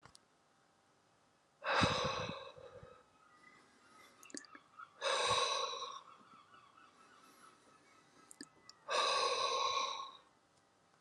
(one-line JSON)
{"exhalation_length": "11.0 s", "exhalation_amplitude": 3884, "exhalation_signal_mean_std_ratio": 0.46, "survey_phase": "alpha (2021-03-01 to 2021-08-12)", "age": "45-64", "gender": "Male", "wearing_mask": "No", "symptom_none": true, "smoker_status": "Ex-smoker", "respiratory_condition_asthma": false, "respiratory_condition_other": false, "recruitment_source": "REACT", "submission_delay": "3 days", "covid_test_result": "Negative", "covid_test_method": "RT-qPCR"}